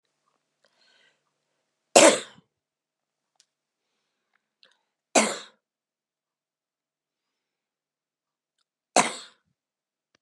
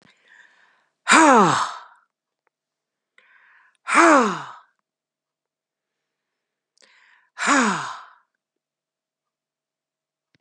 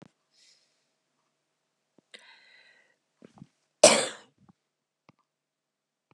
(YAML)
three_cough_length: 10.2 s
three_cough_amplitude: 30757
three_cough_signal_mean_std_ratio: 0.16
exhalation_length: 10.4 s
exhalation_amplitude: 31735
exhalation_signal_mean_std_ratio: 0.3
cough_length: 6.1 s
cough_amplitude: 28274
cough_signal_mean_std_ratio: 0.14
survey_phase: beta (2021-08-13 to 2022-03-07)
age: 65+
gender: Female
wearing_mask: 'No'
symptom_cough_any: true
symptom_sore_throat: true
symptom_fatigue: true
symptom_onset: 13 days
smoker_status: Never smoked
respiratory_condition_asthma: false
respiratory_condition_other: true
recruitment_source: REACT
submission_delay: 1 day
covid_test_result: Negative
covid_test_method: RT-qPCR
influenza_a_test_result: Unknown/Void
influenza_b_test_result: Unknown/Void